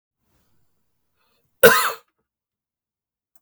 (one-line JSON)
{"cough_length": "3.4 s", "cough_amplitude": 32768, "cough_signal_mean_std_ratio": 0.2, "survey_phase": "beta (2021-08-13 to 2022-03-07)", "age": "45-64", "gender": "Male", "wearing_mask": "No", "symptom_new_continuous_cough": true, "symptom_runny_or_blocked_nose": true, "symptom_headache": true, "symptom_change_to_sense_of_smell_or_taste": true, "symptom_loss_of_taste": true, "smoker_status": "Current smoker (1 to 10 cigarettes per day)", "respiratory_condition_asthma": false, "respiratory_condition_other": false, "recruitment_source": "Test and Trace", "submission_delay": "2 days", "covid_test_result": "Positive", "covid_test_method": "RT-qPCR", "covid_ct_value": 18.1, "covid_ct_gene": "ORF1ab gene", "covid_ct_mean": 18.4, "covid_viral_load": "900000 copies/ml", "covid_viral_load_category": "Low viral load (10K-1M copies/ml)"}